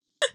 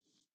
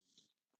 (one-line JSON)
{"three_cough_length": "0.3 s", "three_cough_amplitude": 9567, "three_cough_signal_mean_std_ratio": 0.34, "cough_length": "0.3 s", "cough_amplitude": 36, "cough_signal_mean_std_ratio": 0.75, "exhalation_length": "0.6 s", "exhalation_amplitude": 73, "exhalation_signal_mean_std_ratio": 0.5, "survey_phase": "beta (2021-08-13 to 2022-03-07)", "age": "45-64", "gender": "Female", "wearing_mask": "No", "symptom_runny_or_blocked_nose": true, "smoker_status": "Never smoked", "respiratory_condition_asthma": false, "respiratory_condition_other": false, "recruitment_source": "Test and Trace", "submission_delay": "4 days", "covid_test_result": "Positive", "covid_test_method": "ePCR"}